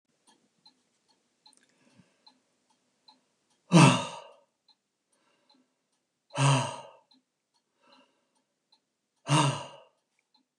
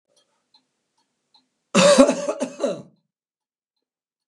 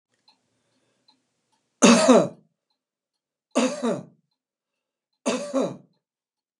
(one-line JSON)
{"exhalation_length": "10.6 s", "exhalation_amplitude": 17173, "exhalation_signal_mean_std_ratio": 0.23, "cough_length": "4.3 s", "cough_amplitude": 32767, "cough_signal_mean_std_ratio": 0.31, "three_cough_length": "6.6 s", "three_cough_amplitude": 27820, "three_cough_signal_mean_std_ratio": 0.3, "survey_phase": "beta (2021-08-13 to 2022-03-07)", "age": "65+", "gender": "Male", "wearing_mask": "No", "symptom_shortness_of_breath": true, "symptom_onset": "12 days", "smoker_status": "Ex-smoker", "respiratory_condition_asthma": true, "respiratory_condition_other": false, "recruitment_source": "REACT", "submission_delay": "1 day", "covid_test_result": "Negative", "covid_test_method": "RT-qPCR", "influenza_a_test_result": "Negative", "influenza_b_test_result": "Negative"}